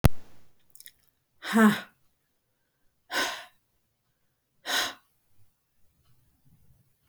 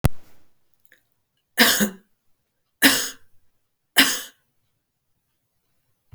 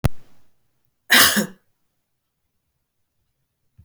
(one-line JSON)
{"exhalation_length": "7.1 s", "exhalation_amplitude": 21902, "exhalation_signal_mean_std_ratio": 0.28, "three_cough_length": "6.1 s", "three_cough_amplitude": 32768, "three_cough_signal_mean_std_ratio": 0.3, "cough_length": "3.8 s", "cough_amplitude": 32768, "cough_signal_mean_std_ratio": 0.28, "survey_phase": "beta (2021-08-13 to 2022-03-07)", "age": "65+", "gender": "Female", "wearing_mask": "No", "symptom_none": true, "smoker_status": "Never smoked", "respiratory_condition_asthma": false, "respiratory_condition_other": false, "recruitment_source": "REACT", "submission_delay": "1 day", "covid_test_result": "Negative", "covid_test_method": "RT-qPCR", "influenza_a_test_result": "Negative", "influenza_b_test_result": "Negative"}